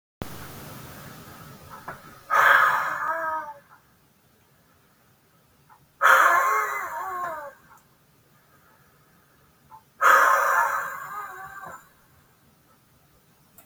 {"exhalation_length": "13.7 s", "exhalation_amplitude": 24383, "exhalation_signal_mean_std_ratio": 0.41, "survey_phase": "beta (2021-08-13 to 2022-03-07)", "age": "65+", "gender": "Male", "wearing_mask": "No", "symptom_none": true, "smoker_status": "Never smoked", "respiratory_condition_asthma": true, "respiratory_condition_other": false, "recruitment_source": "REACT", "submission_delay": "2 days", "covid_test_result": "Negative", "covid_test_method": "RT-qPCR", "influenza_a_test_result": "Negative", "influenza_b_test_result": "Negative"}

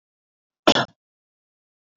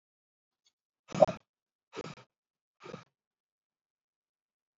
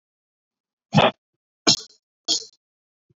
{"cough_length": "2.0 s", "cough_amplitude": 26532, "cough_signal_mean_std_ratio": 0.19, "exhalation_length": "4.8 s", "exhalation_amplitude": 16403, "exhalation_signal_mean_std_ratio": 0.13, "three_cough_length": "3.2 s", "three_cough_amplitude": 29224, "three_cough_signal_mean_std_ratio": 0.26, "survey_phase": "beta (2021-08-13 to 2022-03-07)", "age": "18-44", "gender": "Male", "wearing_mask": "No", "symptom_none": true, "smoker_status": "Never smoked", "respiratory_condition_asthma": false, "respiratory_condition_other": false, "recruitment_source": "REACT", "submission_delay": "1 day", "covid_test_result": "Negative", "covid_test_method": "RT-qPCR", "influenza_a_test_result": "Negative", "influenza_b_test_result": "Negative"}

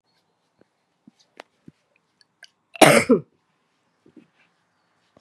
{"cough_length": "5.2 s", "cough_amplitude": 32768, "cough_signal_mean_std_ratio": 0.19, "survey_phase": "beta (2021-08-13 to 2022-03-07)", "age": "45-64", "gender": "Female", "wearing_mask": "No", "symptom_cough_any": true, "symptom_runny_or_blocked_nose": true, "symptom_shortness_of_breath": true, "symptom_sore_throat": true, "symptom_fatigue": true, "symptom_headache": true, "symptom_change_to_sense_of_smell_or_taste": true, "symptom_loss_of_taste": true, "symptom_onset": "2 days", "smoker_status": "Current smoker (1 to 10 cigarettes per day)", "respiratory_condition_asthma": false, "respiratory_condition_other": false, "recruitment_source": "Test and Trace", "submission_delay": "1 day", "covid_test_result": "Positive", "covid_test_method": "RT-qPCR", "covid_ct_value": 19.3, "covid_ct_gene": "ORF1ab gene", "covid_ct_mean": 19.8, "covid_viral_load": "330000 copies/ml", "covid_viral_load_category": "Low viral load (10K-1M copies/ml)"}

